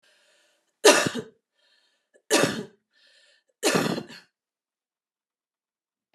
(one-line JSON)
{"three_cough_length": "6.1 s", "three_cough_amplitude": 28240, "three_cough_signal_mean_std_ratio": 0.28, "survey_phase": "beta (2021-08-13 to 2022-03-07)", "age": "45-64", "gender": "Female", "wearing_mask": "No", "symptom_headache": true, "smoker_status": "Current smoker (1 to 10 cigarettes per day)", "respiratory_condition_asthma": false, "respiratory_condition_other": false, "recruitment_source": "Test and Trace", "submission_delay": "1 day", "covid_test_result": "Positive", "covid_test_method": "RT-qPCR", "covid_ct_value": 32.4, "covid_ct_gene": "ORF1ab gene"}